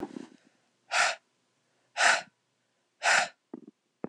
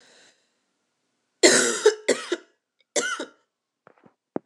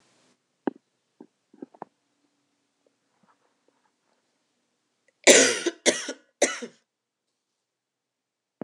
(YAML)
exhalation_length: 4.1 s
exhalation_amplitude: 12470
exhalation_signal_mean_std_ratio: 0.35
three_cough_length: 4.5 s
three_cough_amplitude: 25813
three_cough_signal_mean_std_ratio: 0.32
cough_length: 8.6 s
cough_amplitude: 26028
cough_signal_mean_std_ratio: 0.2
survey_phase: alpha (2021-03-01 to 2021-08-12)
age: 18-44
gender: Female
wearing_mask: 'No'
symptom_new_continuous_cough: true
symptom_diarrhoea: true
symptom_fatigue: true
symptom_onset: 3 days
smoker_status: Never smoked
respiratory_condition_asthma: false
respiratory_condition_other: false
recruitment_source: Test and Trace
submission_delay: 1 day
covid_test_result: Positive
covid_test_method: RT-qPCR
covid_ct_value: 30.0
covid_ct_gene: N gene